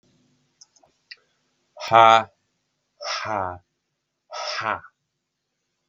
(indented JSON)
{
  "exhalation_length": "5.9 s",
  "exhalation_amplitude": 32115,
  "exhalation_signal_mean_std_ratio": 0.25,
  "survey_phase": "beta (2021-08-13 to 2022-03-07)",
  "age": "45-64",
  "gender": "Male",
  "wearing_mask": "No",
  "symptom_none": true,
  "symptom_onset": "2 days",
  "smoker_status": "Never smoked",
  "respiratory_condition_asthma": false,
  "respiratory_condition_other": false,
  "recruitment_source": "REACT",
  "submission_delay": "2 days",
  "covid_test_result": "Negative",
  "covid_test_method": "RT-qPCR",
  "influenza_a_test_result": "Negative",
  "influenza_b_test_result": "Negative"
}